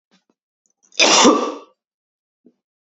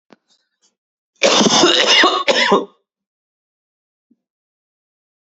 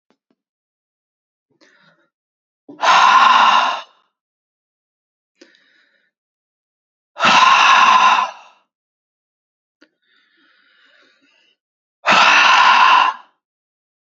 cough_length: 2.8 s
cough_amplitude: 31253
cough_signal_mean_std_ratio: 0.34
three_cough_length: 5.2 s
three_cough_amplitude: 32768
three_cough_signal_mean_std_ratio: 0.42
exhalation_length: 14.2 s
exhalation_amplitude: 31784
exhalation_signal_mean_std_ratio: 0.4
survey_phase: beta (2021-08-13 to 2022-03-07)
age: 18-44
gender: Male
wearing_mask: 'No'
symptom_cough_any: true
symptom_runny_or_blocked_nose: true
symptom_sore_throat: true
symptom_onset: 12 days
smoker_status: Never smoked
respiratory_condition_asthma: false
respiratory_condition_other: false
recruitment_source: REACT
submission_delay: 1 day
covid_test_result: Negative
covid_test_method: RT-qPCR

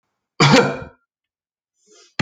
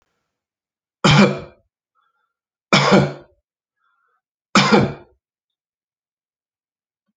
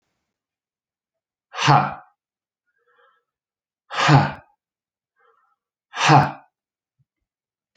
cough_length: 2.2 s
cough_amplitude: 31181
cough_signal_mean_std_ratio: 0.33
three_cough_length: 7.2 s
three_cough_amplitude: 32767
three_cough_signal_mean_std_ratio: 0.3
exhalation_length: 7.8 s
exhalation_amplitude: 32768
exhalation_signal_mean_std_ratio: 0.27
survey_phase: alpha (2021-03-01 to 2021-08-12)
age: 45-64
gender: Male
wearing_mask: 'No'
symptom_none: true
smoker_status: Ex-smoker
respiratory_condition_asthma: false
respiratory_condition_other: false
recruitment_source: REACT
submission_delay: 2 days
covid_test_result: Negative
covid_test_method: RT-qPCR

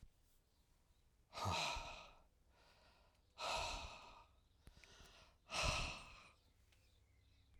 exhalation_length: 7.6 s
exhalation_amplitude: 1403
exhalation_signal_mean_std_ratio: 0.45
survey_phase: alpha (2021-03-01 to 2021-08-12)
age: 65+
gender: Male
wearing_mask: 'No'
symptom_none: true
smoker_status: Ex-smoker
respiratory_condition_asthma: false
respiratory_condition_other: false
recruitment_source: REACT
submission_delay: 1 day
covid_test_result: Negative
covid_test_method: RT-qPCR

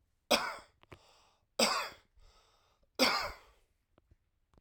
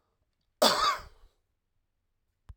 three_cough_length: 4.6 s
three_cough_amplitude: 8249
three_cough_signal_mean_std_ratio: 0.33
cough_length: 2.6 s
cough_amplitude: 15966
cough_signal_mean_std_ratio: 0.3
survey_phase: alpha (2021-03-01 to 2021-08-12)
age: 45-64
gender: Male
wearing_mask: 'No'
symptom_none: true
smoker_status: Never smoked
respiratory_condition_asthma: true
respiratory_condition_other: false
recruitment_source: REACT
submission_delay: 2 days
covid_test_result: Negative
covid_test_method: RT-qPCR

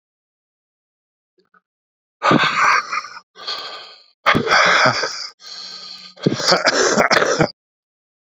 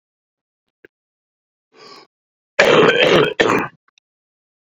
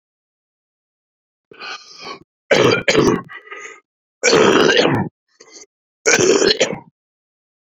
exhalation_length: 8.4 s
exhalation_amplitude: 32669
exhalation_signal_mean_std_ratio: 0.5
cough_length: 4.8 s
cough_amplitude: 29477
cough_signal_mean_std_ratio: 0.37
three_cough_length: 7.8 s
three_cough_amplitude: 32768
three_cough_signal_mean_std_ratio: 0.45
survey_phase: beta (2021-08-13 to 2022-03-07)
age: 45-64
gender: Male
wearing_mask: 'No'
symptom_cough_any: true
symptom_runny_or_blocked_nose: true
symptom_shortness_of_breath: true
symptom_fatigue: true
symptom_headache: true
symptom_loss_of_taste: true
symptom_onset: 4 days
smoker_status: Never smoked
respiratory_condition_asthma: false
respiratory_condition_other: true
recruitment_source: Test and Trace
submission_delay: 1 day
covid_test_result: Positive
covid_test_method: RT-qPCR
covid_ct_value: 12.5
covid_ct_gene: ORF1ab gene
covid_ct_mean: 12.9
covid_viral_load: 59000000 copies/ml
covid_viral_load_category: High viral load (>1M copies/ml)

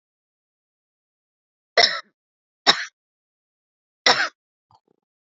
three_cough_length: 5.3 s
three_cough_amplitude: 31209
three_cough_signal_mean_std_ratio: 0.22
survey_phase: beta (2021-08-13 to 2022-03-07)
age: 45-64
gender: Female
wearing_mask: 'No'
symptom_none: true
smoker_status: Current smoker (1 to 10 cigarettes per day)
respiratory_condition_asthma: false
respiratory_condition_other: false
recruitment_source: REACT
submission_delay: 2 days
covid_test_result: Negative
covid_test_method: RT-qPCR
influenza_a_test_result: Unknown/Void
influenza_b_test_result: Unknown/Void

